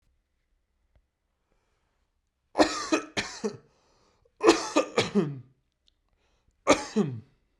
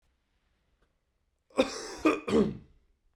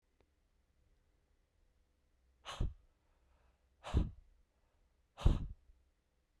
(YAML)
three_cough_length: 7.6 s
three_cough_amplitude: 24499
three_cough_signal_mean_std_ratio: 0.32
cough_length: 3.2 s
cough_amplitude: 10275
cough_signal_mean_std_ratio: 0.34
exhalation_length: 6.4 s
exhalation_amplitude: 5140
exhalation_signal_mean_std_ratio: 0.23
survey_phase: beta (2021-08-13 to 2022-03-07)
age: 18-44
gender: Male
wearing_mask: 'Yes'
symptom_cough_any: true
symptom_runny_or_blocked_nose: true
symptom_sore_throat: true
symptom_fatigue: true
symptom_headache: true
symptom_onset: 4 days
smoker_status: Never smoked
respiratory_condition_asthma: false
respiratory_condition_other: false
recruitment_source: Test and Trace
submission_delay: 0 days
covid_test_result: Positive
covid_test_method: RT-qPCR
covid_ct_value: 19.8
covid_ct_gene: N gene
covid_ct_mean: 20.2
covid_viral_load: 240000 copies/ml
covid_viral_load_category: Low viral load (10K-1M copies/ml)